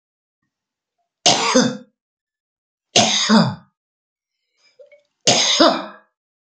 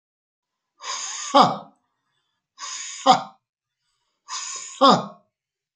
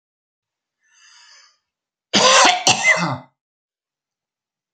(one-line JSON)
{"three_cough_length": "6.5 s", "three_cough_amplitude": 32768, "three_cough_signal_mean_std_ratio": 0.39, "exhalation_length": "5.8 s", "exhalation_amplitude": 26910, "exhalation_signal_mean_std_ratio": 0.31, "cough_length": "4.7 s", "cough_amplitude": 32767, "cough_signal_mean_std_ratio": 0.35, "survey_phase": "beta (2021-08-13 to 2022-03-07)", "age": "65+", "gender": "Male", "wearing_mask": "No", "symptom_none": true, "symptom_onset": "12 days", "smoker_status": "Ex-smoker", "respiratory_condition_asthma": false, "respiratory_condition_other": false, "recruitment_source": "REACT", "submission_delay": "1 day", "covid_test_result": "Negative", "covid_test_method": "RT-qPCR"}